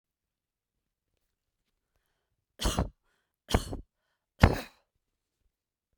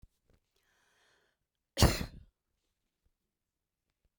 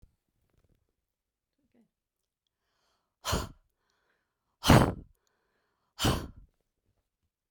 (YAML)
three_cough_length: 6.0 s
three_cough_amplitude: 32767
three_cough_signal_mean_std_ratio: 0.19
cough_length: 4.2 s
cough_amplitude: 12306
cough_signal_mean_std_ratio: 0.17
exhalation_length: 7.5 s
exhalation_amplitude: 16753
exhalation_signal_mean_std_ratio: 0.21
survey_phase: beta (2021-08-13 to 2022-03-07)
age: 65+
gender: Female
wearing_mask: 'No'
symptom_none: true
smoker_status: Never smoked
respiratory_condition_asthma: false
respiratory_condition_other: false
recruitment_source: REACT
submission_delay: 2 days
covid_test_result: Negative
covid_test_method: RT-qPCR